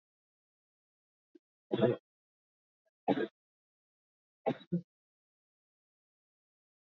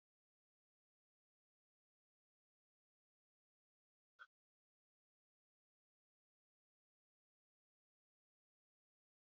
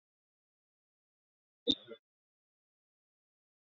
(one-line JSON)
{"three_cough_length": "7.0 s", "three_cough_amplitude": 6571, "three_cough_signal_mean_std_ratio": 0.21, "exhalation_length": "9.3 s", "exhalation_amplitude": 147, "exhalation_signal_mean_std_ratio": 0.06, "cough_length": "3.8 s", "cough_amplitude": 5519, "cough_signal_mean_std_ratio": 0.11, "survey_phase": "beta (2021-08-13 to 2022-03-07)", "age": "45-64", "gender": "Female", "wearing_mask": "No", "symptom_cough_any": true, "symptom_runny_or_blocked_nose": true, "symptom_shortness_of_breath": true, "symptom_sore_throat": true, "symptom_headache": true, "symptom_onset": "3 days", "smoker_status": "Ex-smoker", "respiratory_condition_asthma": false, "respiratory_condition_other": false, "recruitment_source": "Test and Trace", "submission_delay": "2 days", "covid_test_result": "Positive", "covid_test_method": "RT-qPCR", "covid_ct_value": 23.2, "covid_ct_gene": "ORF1ab gene", "covid_ct_mean": 23.9, "covid_viral_load": "14000 copies/ml", "covid_viral_load_category": "Low viral load (10K-1M copies/ml)"}